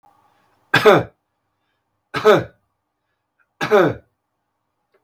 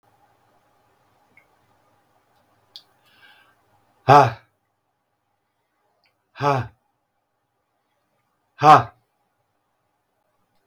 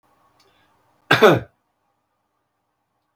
{"three_cough_length": "5.0 s", "three_cough_amplitude": 32768, "three_cough_signal_mean_std_ratio": 0.3, "exhalation_length": "10.7 s", "exhalation_amplitude": 32768, "exhalation_signal_mean_std_ratio": 0.18, "cough_length": "3.2 s", "cough_amplitude": 32768, "cough_signal_mean_std_ratio": 0.22, "survey_phase": "beta (2021-08-13 to 2022-03-07)", "age": "65+", "gender": "Male", "wearing_mask": "No", "symptom_none": true, "smoker_status": "Never smoked", "respiratory_condition_asthma": false, "respiratory_condition_other": false, "recruitment_source": "REACT", "submission_delay": "3 days", "covid_test_result": "Negative", "covid_test_method": "RT-qPCR", "influenza_a_test_result": "Negative", "influenza_b_test_result": "Negative"}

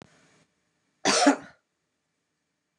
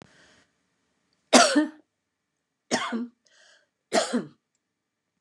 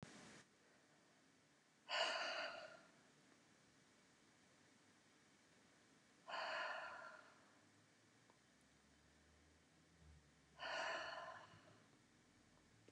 {"cough_length": "2.8 s", "cough_amplitude": 16704, "cough_signal_mean_std_ratio": 0.27, "three_cough_length": "5.2 s", "three_cough_amplitude": 28855, "three_cough_signal_mean_std_ratio": 0.29, "exhalation_length": "12.9 s", "exhalation_amplitude": 1041, "exhalation_signal_mean_std_ratio": 0.44, "survey_phase": "beta (2021-08-13 to 2022-03-07)", "age": "65+", "gender": "Female", "wearing_mask": "No", "symptom_none": true, "smoker_status": "Never smoked", "respiratory_condition_asthma": false, "respiratory_condition_other": false, "recruitment_source": "REACT", "submission_delay": "1 day", "covid_test_result": "Negative", "covid_test_method": "RT-qPCR", "influenza_a_test_result": "Unknown/Void", "influenza_b_test_result": "Unknown/Void"}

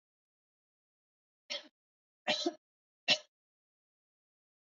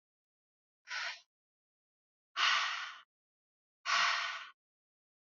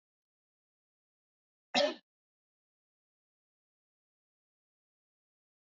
{"three_cough_length": "4.7 s", "three_cough_amplitude": 5824, "three_cough_signal_mean_std_ratio": 0.21, "exhalation_length": "5.2 s", "exhalation_amplitude": 4399, "exhalation_signal_mean_std_ratio": 0.39, "cough_length": "5.7 s", "cough_amplitude": 5766, "cough_signal_mean_std_ratio": 0.14, "survey_phase": "alpha (2021-03-01 to 2021-08-12)", "age": "45-64", "gender": "Female", "wearing_mask": "No", "symptom_none": true, "smoker_status": "Never smoked", "respiratory_condition_asthma": false, "respiratory_condition_other": false, "recruitment_source": "Test and Trace", "submission_delay": "0 days", "covid_test_result": "Negative", "covid_test_method": "LFT"}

